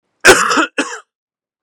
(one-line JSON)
{"cough_length": "1.6 s", "cough_amplitude": 32768, "cough_signal_mean_std_ratio": 0.43, "survey_phase": "beta (2021-08-13 to 2022-03-07)", "age": "18-44", "gender": "Male", "wearing_mask": "No", "symptom_runny_or_blocked_nose": true, "smoker_status": "Never smoked", "respiratory_condition_asthma": false, "respiratory_condition_other": false, "recruitment_source": "REACT", "submission_delay": "1 day", "covid_test_result": "Negative", "covid_test_method": "RT-qPCR", "influenza_a_test_result": "Negative", "influenza_b_test_result": "Negative"}